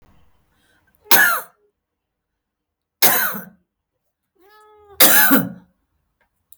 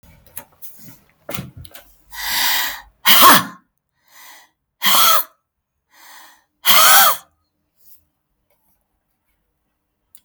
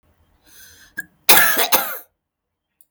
{"three_cough_length": "6.6 s", "three_cough_amplitude": 32767, "three_cough_signal_mean_std_ratio": 0.33, "exhalation_length": "10.2 s", "exhalation_amplitude": 32768, "exhalation_signal_mean_std_ratio": 0.35, "cough_length": "2.9 s", "cough_amplitude": 32768, "cough_signal_mean_std_ratio": 0.35, "survey_phase": "beta (2021-08-13 to 2022-03-07)", "age": "45-64", "gender": "Female", "wearing_mask": "No", "symptom_fatigue": true, "smoker_status": "Current smoker (11 or more cigarettes per day)", "respiratory_condition_asthma": false, "respiratory_condition_other": false, "recruitment_source": "Test and Trace", "submission_delay": "0 days", "covid_test_result": "Negative", "covid_test_method": "LFT"}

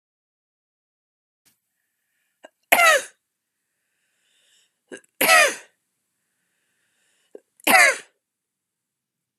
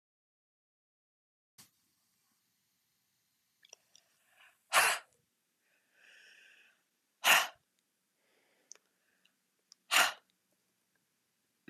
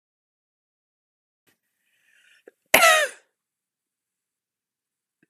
{"three_cough_length": "9.4 s", "three_cough_amplitude": 32768, "three_cough_signal_mean_std_ratio": 0.24, "exhalation_length": "11.7 s", "exhalation_amplitude": 8664, "exhalation_signal_mean_std_ratio": 0.19, "cough_length": "5.3 s", "cough_amplitude": 32768, "cough_signal_mean_std_ratio": 0.19, "survey_phase": "beta (2021-08-13 to 2022-03-07)", "age": "45-64", "gender": "Female", "wearing_mask": "No", "symptom_cough_any": true, "symptom_runny_or_blocked_nose": true, "symptom_other": true, "symptom_onset": "4 days", "smoker_status": "Never smoked", "respiratory_condition_asthma": false, "respiratory_condition_other": false, "recruitment_source": "Test and Trace", "submission_delay": "1 day", "covid_test_result": "Positive", "covid_test_method": "RT-qPCR", "covid_ct_value": 18.1, "covid_ct_gene": "N gene"}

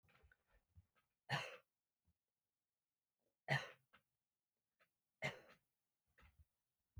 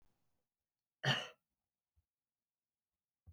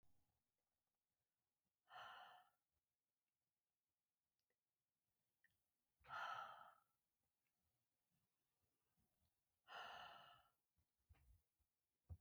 {"three_cough_length": "7.0 s", "three_cough_amplitude": 1567, "three_cough_signal_mean_std_ratio": 0.22, "cough_length": "3.3 s", "cough_amplitude": 2648, "cough_signal_mean_std_ratio": 0.19, "exhalation_length": "12.2 s", "exhalation_amplitude": 294, "exhalation_signal_mean_std_ratio": 0.32, "survey_phase": "beta (2021-08-13 to 2022-03-07)", "age": "45-64", "gender": "Female", "wearing_mask": "No", "symptom_sore_throat": true, "symptom_onset": "4 days", "smoker_status": "Never smoked", "respiratory_condition_asthma": false, "respiratory_condition_other": false, "recruitment_source": "REACT", "submission_delay": "3 days", "covid_test_result": "Negative", "covid_test_method": "RT-qPCR"}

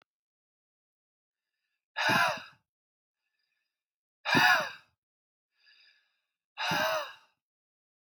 {"exhalation_length": "8.2 s", "exhalation_amplitude": 8979, "exhalation_signal_mean_std_ratio": 0.31, "survey_phase": "beta (2021-08-13 to 2022-03-07)", "age": "18-44", "gender": "Male", "wearing_mask": "No", "symptom_runny_or_blocked_nose": true, "symptom_shortness_of_breath": true, "symptom_sore_throat": true, "symptom_fatigue": true, "symptom_headache": true, "symptom_onset": "3 days", "smoker_status": "Never smoked", "respiratory_condition_asthma": false, "respiratory_condition_other": false, "recruitment_source": "Test and Trace", "submission_delay": "2 days", "covid_test_result": "Positive", "covid_test_method": "RT-qPCR", "covid_ct_value": 20.4, "covid_ct_gene": "ORF1ab gene"}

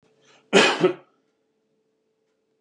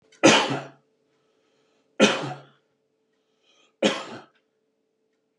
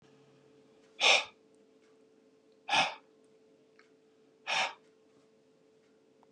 {"cough_length": "2.6 s", "cough_amplitude": 24338, "cough_signal_mean_std_ratio": 0.29, "three_cough_length": "5.4 s", "three_cough_amplitude": 28037, "three_cough_signal_mean_std_ratio": 0.28, "exhalation_length": "6.3 s", "exhalation_amplitude": 8853, "exhalation_signal_mean_std_ratio": 0.27, "survey_phase": "beta (2021-08-13 to 2022-03-07)", "age": "45-64", "gender": "Male", "wearing_mask": "No", "symptom_runny_or_blocked_nose": true, "smoker_status": "Ex-smoker", "respiratory_condition_asthma": false, "respiratory_condition_other": false, "recruitment_source": "REACT", "submission_delay": "2 days", "covid_test_result": "Negative", "covid_test_method": "RT-qPCR"}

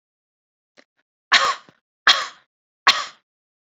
{"exhalation_length": "3.8 s", "exhalation_amplitude": 29547, "exhalation_signal_mean_std_ratio": 0.27, "survey_phase": "beta (2021-08-13 to 2022-03-07)", "age": "45-64", "gender": "Female", "wearing_mask": "No", "symptom_cough_any": true, "symptom_sore_throat": true, "symptom_diarrhoea": true, "smoker_status": "Ex-smoker", "respiratory_condition_asthma": false, "respiratory_condition_other": false, "recruitment_source": "Test and Trace", "submission_delay": "2 days", "covid_test_result": "Positive", "covid_test_method": "RT-qPCR", "covid_ct_value": 34.4, "covid_ct_gene": "ORF1ab gene", "covid_ct_mean": 34.4, "covid_viral_load": "5.3 copies/ml", "covid_viral_load_category": "Minimal viral load (< 10K copies/ml)"}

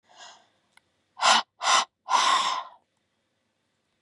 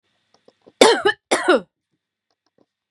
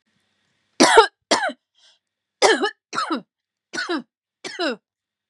{"exhalation_length": "4.0 s", "exhalation_amplitude": 16730, "exhalation_signal_mean_std_ratio": 0.4, "cough_length": "2.9 s", "cough_amplitude": 32768, "cough_signal_mean_std_ratio": 0.32, "three_cough_length": "5.3 s", "three_cough_amplitude": 32767, "three_cough_signal_mean_std_ratio": 0.35, "survey_phase": "beta (2021-08-13 to 2022-03-07)", "age": "18-44", "gender": "Female", "wearing_mask": "No", "symptom_none": true, "smoker_status": "Never smoked", "respiratory_condition_asthma": false, "respiratory_condition_other": false, "recruitment_source": "REACT", "submission_delay": "4 days", "covid_test_result": "Negative", "covid_test_method": "RT-qPCR", "influenza_a_test_result": "Negative", "influenza_b_test_result": "Negative"}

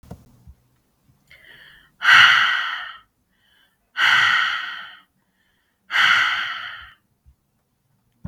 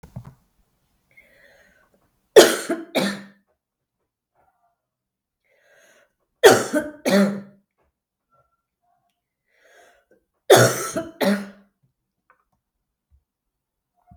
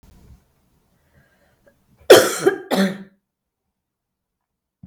{"exhalation_length": "8.3 s", "exhalation_amplitude": 32766, "exhalation_signal_mean_std_ratio": 0.4, "three_cough_length": "14.2 s", "three_cough_amplitude": 32768, "three_cough_signal_mean_std_ratio": 0.25, "cough_length": "4.9 s", "cough_amplitude": 32768, "cough_signal_mean_std_ratio": 0.24, "survey_phase": "beta (2021-08-13 to 2022-03-07)", "age": "45-64", "gender": "Female", "wearing_mask": "No", "symptom_cough_any": true, "symptom_runny_or_blocked_nose": true, "symptom_fatigue": true, "symptom_fever_high_temperature": true, "symptom_change_to_sense_of_smell_or_taste": true, "smoker_status": "Ex-smoker", "respiratory_condition_asthma": false, "respiratory_condition_other": false, "recruitment_source": "Test and Trace", "submission_delay": "2 days", "covid_test_result": "Positive", "covid_test_method": "RT-qPCR", "covid_ct_value": 17.7, "covid_ct_gene": "ORF1ab gene", "covid_ct_mean": 18.2, "covid_viral_load": "1100000 copies/ml", "covid_viral_load_category": "High viral load (>1M copies/ml)"}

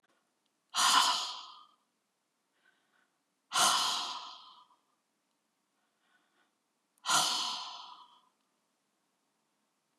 {"exhalation_length": "10.0 s", "exhalation_amplitude": 8926, "exhalation_signal_mean_std_ratio": 0.34, "survey_phase": "beta (2021-08-13 to 2022-03-07)", "age": "45-64", "gender": "Female", "wearing_mask": "No", "symptom_cough_any": true, "symptom_shortness_of_breath": true, "symptom_diarrhoea": true, "smoker_status": "Ex-smoker", "respiratory_condition_asthma": false, "respiratory_condition_other": true, "recruitment_source": "REACT", "submission_delay": "0 days", "covid_test_result": "Negative", "covid_test_method": "RT-qPCR", "influenza_a_test_result": "Negative", "influenza_b_test_result": "Negative"}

